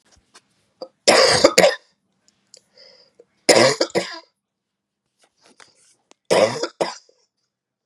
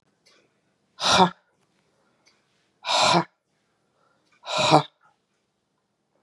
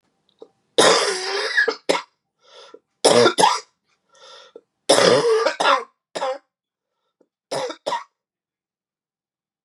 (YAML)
three_cough_length: 7.9 s
three_cough_amplitude: 32768
three_cough_signal_mean_std_ratio: 0.33
exhalation_length: 6.2 s
exhalation_amplitude: 31115
exhalation_signal_mean_std_ratio: 0.3
cough_length: 9.6 s
cough_amplitude: 31509
cough_signal_mean_std_ratio: 0.42
survey_phase: beta (2021-08-13 to 2022-03-07)
age: 45-64
gender: Female
wearing_mask: 'No'
symptom_cough_any: true
symptom_runny_or_blocked_nose: true
symptom_sore_throat: true
symptom_diarrhoea: true
symptom_fatigue: true
symptom_headache: true
symptom_other: true
symptom_onset: 4 days
smoker_status: Current smoker (1 to 10 cigarettes per day)
respiratory_condition_asthma: false
respiratory_condition_other: false
recruitment_source: Test and Trace
submission_delay: 2 days
covid_test_result: Positive
covid_test_method: RT-qPCR
covid_ct_value: 19.2
covid_ct_gene: ORF1ab gene
covid_ct_mean: 19.3
covid_viral_load: 480000 copies/ml
covid_viral_load_category: Low viral load (10K-1M copies/ml)